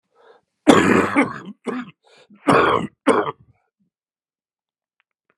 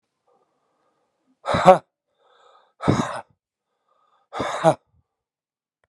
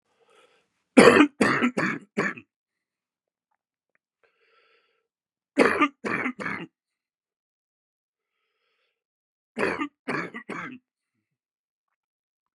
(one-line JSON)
{"cough_length": "5.4 s", "cough_amplitude": 32768, "cough_signal_mean_std_ratio": 0.38, "exhalation_length": "5.9 s", "exhalation_amplitude": 32767, "exhalation_signal_mean_std_ratio": 0.24, "three_cough_length": "12.5 s", "three_cough_amplitude": 32379, "three_cough_signal_mean_std_ratio": 0.27, "survey_phase": "beta (2021-08-13 to 2022-03-07)", "age": "65+", "gender": "Male", "wearing_mask": "No", "symptom_cough_any": true, "symptom_new_continuous_cough": true, "symptom_runny_or_blocked_nose": true, "symptom_fever_high_temperature": true, "symptom_headache": true, "smoker_status": "Never smoked", "respiratory_condition_asthma": false, "respiratory_condition_other": false, "recruitment_source": "Test and Trace", "submission_delay": "1 day", "covid_test_result": "Positive", "covid_test_method": "LFT"}